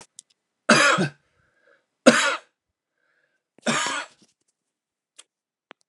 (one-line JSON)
{"three_cough_length": "5.9 s", "three_cough_amplitude": 32767, "three_cough_signal_mean_std_ratio": 0.3, "survey_phase": "beta (2021-08-13 to 2022-03-07)", "age": "45-64", "gender": "Male", "wearing_mask": "No", "symptom_none": true, "smoker_status": "Never smoked", "respiratory_condition_asthma": false, "respiratory_condition_other": false, "recruitment_source": "REACT", "submission_delay": "3 days", "covid_test_result": "Negative", "covid_test_method": "RT-qPCR"}